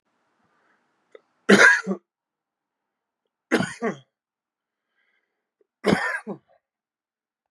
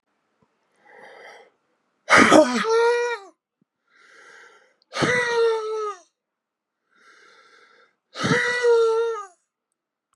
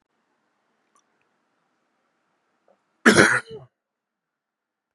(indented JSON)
{
  "three_cough_length": "7.5 s",
  "three_cough_amplitude": 28427,
  "three_cough_signal_mean_std_ratio": 0.25,
  "exhalation_length": "10.2 s",
  "exhalation_amplitude": 32470,
  "exhalation_signal_mean_std_ratio": 0.43,
  "cough_length": "4.9 s",
  "cough_amplitude": 32768,
  "cough_signal_mean_std_ratio": 0.2,
  "survey_phase": "beta (2021-08-13 to 2022-03-07)",
  "age": "45-64",
  "gender": "Male",
  "wearing_mask": "No",
  "symptom_none": true,
  "symptom_onset": "9 days",
  "smoker_status": "Ex-smoker",
  "respiratory_condition_asthma": false,
  "respiratory_condition_other": false,
  "recruitment_source": "REACT",
  "submission_delay": "1 day",
  "covid_test_result": "Negative",
  "covid_test_method": "RT-qPCR",
  "influenza_a_test_result": "Negative",
  "influenza_b_test_result": "Negative"
}